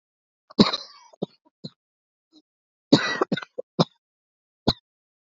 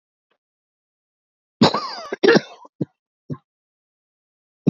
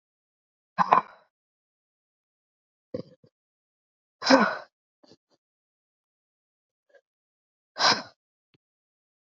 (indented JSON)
{
  "three_cough_length": "5.4 s",
  "three_cough_amplitude": 27192,
  "three_cough_signal_mean_std_ratio": 0.23,
  "cough_length": "4.7 s",
  "cough_amplitude": 29139,
  "cough_signal_mean_std_ratio": 0.25,
  "exhalation_length": "9.2 s",
  "exhalation_amplitude": 24861,
  "exhalation_signal_mean_std_ratio": 0.2,
  "survey_phase": "beta (2021-08-13 to 2022-03-07)",
  "age": "18-44",
  "gender": "Female",
  "wearing_mask": "No",
  "symptom_cough_any": true,
  "symptom_sore_throat": true,
  "symptom_abdominal_pain": true,
  "symptom_fatigue": true,
  "symptom_fever_high_temperature": true,
  "symptom_headache": true,
  "symptom_other": true,
  "smoker_status": "Current smoker (e-cigarettes or vapes only)",
  "respiratory_condition_asthma": false,
  "respiratory_condition_other": false,
  "recruitment_source": "Test and Trace",
  "submission_delay": "1 day",
  "covid_test_result": "Positive",
  "covid_test_method": "LFT"
}